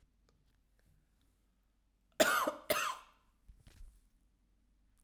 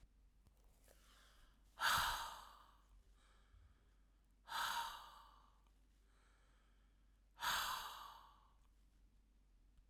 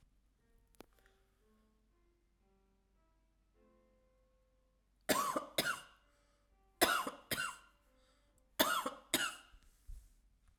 {"cough_length": "5.0 s", "cough_amplitude": 6968, "cough_signal_mean_std_ratio": 0.28, "exhalation_length": "9.9 s", "exhalation_amplitude": 2175, "exhalation_signal_mean_std_ratio": 0.39, "three_cough_length": "10.6 s", "three_cough_amplitude": 5744, "three_cough_signal_mean_std_ratio": 0.31, "survey_phase": "alpha (2021-03-01 to 2021-08-12)", "age": "45-64", "gender": "Female", "wearing_mask": "No", "symptom_none": true, "smoker_status": "Never smoked", "respiratory_condition_asthma": false, "respiratory_condition_other": false, "recruitment_source": "REACT", "submission_delay": "2 days", "covid_test_result": "Negative", "covid_test_method": "RT-qPCR"}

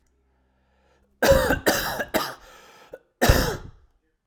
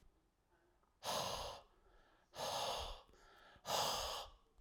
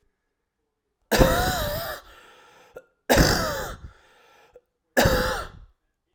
{"cough_length": "4.3 s", "cough_amplitude": 24655, "cough_signal_mean_std_ratio": 0.42, "exhalation_length": "4.6 s", "exhalation_amplitude": 1505, "exhalation_signal_mean_std_ratio": 0.56, "three_cough_length": "6.1 s", "three_cough_amplitude": 30154, "three_cough_signal_mean_std_ratio": 0.43, "survey_phase": "alpha (2021-03-01 to 2021-08-12)", "age": "18-44", "gender": "Male", "wearing_mask": "No", "symptom_none": true, "smoker_status": "Current smoker (e-cigarettes or vapes only)", "respiratory_condition_asthma": false, "respiratory_condition_other": false, "recruitment_source": "REACT", "submission_delay": "2 days", "covid_test_result": "Negative", "covid_test_method": "RT-qPCR"}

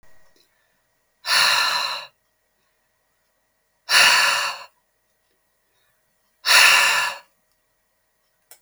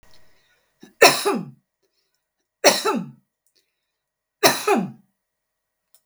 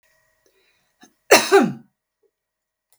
{"exhalation_length": "8.6 s", "exhalation_amplitude": 29828, "exhalation_signal_mean_std_ratio": 0.38, "three_cough_length": "6.1 s", "three_cough_amplitude": 32768, "three_cough_signal_mean_std_ratio": 0.3, "cough_length": "3.0 s", "cough_amplitude": 32768, "cough_signal_mean_std_ratio": 0.26, "survey_phase": "beta (2021-08-13 to 2022-03-07)", "age": "65+", "gender": "Female", "wearing_mask": "No", "symptom_none": true, "smoker_status": "Never smoked", "respiratory_condition_asthma": false, "respiratory_condition_other": false, "recruitment_source": "REACT", "submission_delay": "4 days", "covid_test_result": "Negative", "covid_test_method": "RT-qPCR", "influenza_a_test_result": "Negative", "influenza_b_test_result": "Negative"}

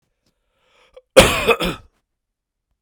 {"cough_length": "2.8 s", "cough_amplitude": 32768, "cough_signal_mean_std_ratio": 0.28, "survey_phase": "beta (2021-08-13 to 2022-03-07)", "age": "45-64", "gender": "Male", "wearing_mask": "No", "symptom_cough_any": true, "symptom_runny_or_blocked_nose": true, "symptom_headache": true, "smoker_status": "Ex-smoker", "respiratory_condition_asthma": false, "respiratory_condition_other": false, "recruitment_source": "Test and Trace", "submission_delay": "1 day", "covid_test_result": "Positive", "covid_test_method": "LFT"}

